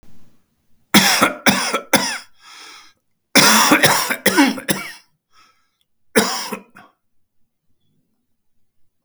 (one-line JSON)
{"cough_length": "9.0 s", "cough_amplitude": 32768, "cough_signal_mean_std_ratio": 0.41, "survey_phase": "beta (2021-08-13 to 2022-03-07)", "age": "65+", "gender": "Male", "wearing_mask": "No", "symptom_runny_or_blocked_nose": true, "smoker_status": "Never smoked", "respiratory_condition_asthma": false, "respiratory_condition_other": false, "recruitment_source": "REACT", "submission_delay": "3 days", "covid_test_result": "Negative", "covid_test_method": "RT-qPCR", "influenza_a_test_result": "Negative", "influenza_b_test_result": "Negative"}